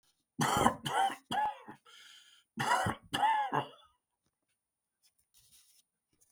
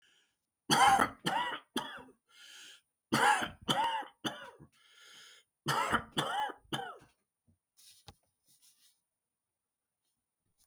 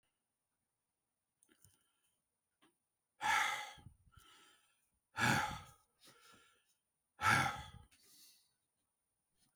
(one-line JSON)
{"cough_length": "6.3 s", "cough_amplitude": 10554, "cough_signal_mean_std_ratio": 0.45, "three_cough_length": "10.7 s", "three_cough_amplitude": 8787, "three_cough_signal_mean_std_ratio": 0.38, "exhalation_length": "9.6 s", "exhalation_amplitude": 4294, "exhalation_signal_mean_std_ratio": 0.29, "survey_phase": "beta (2021-08-13 to 2022-03-07)", "age": "65+", "gender": "Male", "wearing_mask": "No", "symptom_none": true, "smoker_status": "Never smoked", "respiratory_condition_asthma": false, "respiratory_condition_other": false, "recruitment_source": "REACT", "submission_delay": "8 days", "covid_test_result": "Negative", "covid_test_method": "RT-qPCR", "influenza_a_test_result": "Negative", "influenza_b_test_result": "Negative"}